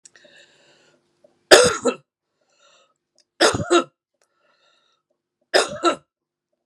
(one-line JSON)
{"three_cough_length": "6.7 s", "three_cough_amplitude": 32768, "three_cough_signal_mean_std_ratio": 0.27, "survey_phase": "beta (2021-08-13 to 2022-03-07)", "age": "45-64", "gender": "Female", "wearing_mask": "No", "symptom_cough_any": true, "symptom_runny_or_blocked_nose": true, "symptom_sore_throat": true, "symptom_diarrhoea": true, "symptom_fatigue": true, "symptom_fever_high_temperature": true, "symptom_headache": true, "symptom_change_to_sense_of_smell_or_taste": true, "symptom_onset": "4 days", "smoker_status": "Never smoked", "respiratory_condition_asthma": false, "respiratory_condition_other": false, "recruitment_source": "Test and Trace", "submission_delay": "2 days", "covid_test_result": "Positive", "covid_test_method": "RT-qPCR"}